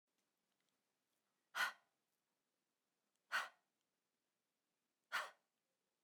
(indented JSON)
{
  "exhalation_length": "6.0 s",
  "exhalation_amplitude": 1355,
  "exhalation_signal_mean_std_ratio": 0.22,
  "survey_phase": "beta (2021-08-13 to 2022-03-07)",
  "age": "45-64",
  "gender": "Female",
  "wearing_mask": "No",
  "symptom_none": true,
  "smoker_status": "Never smoked",
  "respiratory_condition_asthma": false,
  "respiratory_condition_other": false,
  "recruitment_source": "REACT",
  "submission_delay": "1 day",
  "covid_test_result": "Negative",
  "covid_test_method": "RT-qPCR",
  "influenza_a_test_result": "Unknown/Void",
  "influenza_b_test_result": "Unknown/Void"
}